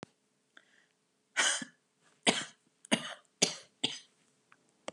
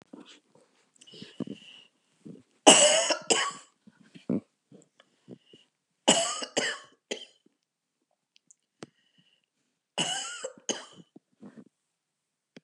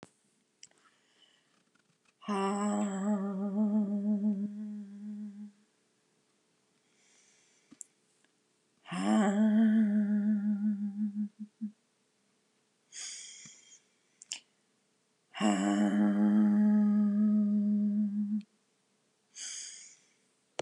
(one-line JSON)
{"cough_length": "4.9 s", "cough_amplitude": 11851, "cough_signal_mean_std_ratio": 0.29, "three_cough_length": "12.6 s", "three_cough_amplitude": 29867, "three_cough_signal_mean_std_ratio": 0.27, "exhalation_length": "20.6 s", "exhalation_amplitude": 5301, "exhalation_signal_mean_std_ratio": 0.63, "survey_phase": "beta (2021-08-13 to 2022-03-07)", "age": "65+", "gender": "Female", "wearing_mask": "No", "symptom_none": true, "smoker_status": "Ex-smoker", "respiratory_condition_asthma": false, "respiratory_condition_other": false, "recruitment_source": "REACT", "submission_delay": "2 days", "covid_test_result": "Negative", "covid_test_method": "RT-qPCR", "influenza_a_test_result": "Negative", "influenza_b_test_result": "Negative"}